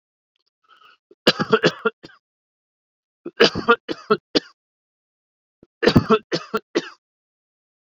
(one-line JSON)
{"three_cough_length": "7.9 s", "three_cough_amplitude": 28880, "three_cough_signal_mean_std_ratio": 0.28, "survey_phase": "beta (2021-08-13 to 2022-03-07)", "age": "45-64", "gender": "Male", "wearing_mask": "No", "symptom_cough_any": true, "symptom_headache": true, "symptom_onset": "5 days", "smoker_status": "Never smoked", "respiratory_condition_asthma": false, "respiratory_condition_other": false, "recruitment_source": "Test and Trace", "submission_delay": "1 day", "covid_test_result": "Positive", "covid_test_method": "RT-qPCR"}